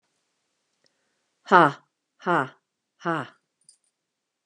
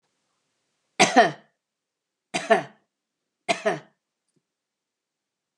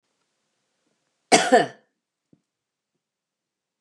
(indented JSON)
{
  "exhalation_length": "4.5 s",
  "exhalation_amplitude": 29179,
  "exhalation_signal_mean_std_ratio": 0.22,
  "three_cough_length": "5.6 s",
  "three_cough_amplitude": 23370,
  "three_cough_signal_mean_std_ratio": 0.24,
  "cough_length": "3.8 s",
  "cough_amplitude": 28833,
  "cough_signal_mean_std_ratio": 0.21,
  "survey_phase": "beta (2021-08-13 to 2022-03-07)",
  "age": "45-64",
  "gender": "Female",
  "wearing_mask": "No",
  "symptom_none": true,
  "smoker_status": "Never smoked",
  "respiratory_condition_asthma": false,
  "respiratory_condition_other": false,
  "recruitment_source": "REACT",
  "submission_delay": "1 day",
  "covid_test_result": "Negative",
  "covid_test_method": "RT-qPCR",
  "influenza_a_test_result": "Negative",
  "influenza_b_test_result": "Negative"
}